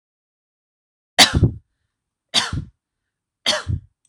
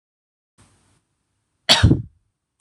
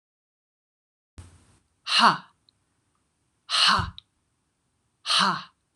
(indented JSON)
{
  "three_cough_length": "4.1 s",
  "three_cough_amplitude": 26028,
  "three_cough_signal_mean_std_ratio": 0.3,
  "cough_length": "2.6 s",
  "cough_amplitude": 26028,
  "cough_signal_mean_std_ratio": 0.25,
  "exhalation_length": "5.8 s",
  "exhalation_amplitude": 19569,
  "exhalation_signal_mean_std_ratio": 0.32,
  "survey_phase": "alpha (2021-03-01 to 2021-08-12)",
  "age": "18-44",
  "gender": "Female",
  "wearing_mask": "No",
  "symptom_none": true,
  "symptom_onset": "12 days",
  "smoker_status": "Ex-smoker",
  "respiratory_condition_asthma": false,
  "respiratory_condition_other": false,
  "recruitment_source": "REACT",
  "submission_delay": "1 day",
  "covid_test_result": "Negative",
  "covid_test_method": "RT-qPCR"
}